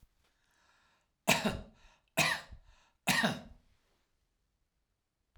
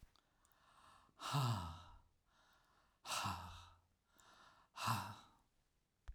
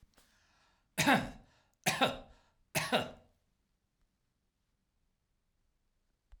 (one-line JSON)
{"three_cough_length": "5.4 s", "three_cough_amplitude": 9707, "three_cough_signal_mean_std_ratio": 0.31, "exhalation_length": "6.1 s", "exhalation_amplitude": 1598, "exhalation_signal_mean_std_ratio": 0.42, "cough_length": "6.4 s", "cough_amplitude": 6555, "cough_signal_mean_std_ratio": 0.28, "survey_phase": "alpha (2021-03-01 to 2021-08-12)", "age": "65+", "gender": "Male", "wearing_mask": "No", "symptom_none": true, "smoker_status": "Ex-smoker", "respiratory_condition_asthma": false, "respiratory_condition_other": false, "recruitment_source": "REACT", "submission_delay": "2 days", "covid_test_result": "Negative", "covid_test_method": "RT-qPCR"}